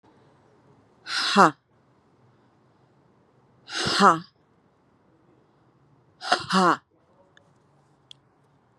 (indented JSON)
{
  "exhalation_length": "8.8 s",
  "exhalation_amplitude": 27813,
  "exhalation_signal_mean_std_ratio": 0.27,
  "survey_phase": "beta (2021-08-13 to 2022-03-07)",
  "age": "45-64",
  "gender": "Female",
  "wearing_mask": "No",
  "symptom_cough_any": true,
  "symptom_onset": "9 days",
  "smoker_status": "Current smoker (11 or more cigarettes per day)",
  "respiratory_condition_asthma": false,
  "respiratory_condition_other": false,
  "recruitment_source": "REACT",
  "submission_delay": "2 days",
  "covid_test_result": "Negative",
  "covid_test_method": "RT-qPCR"
}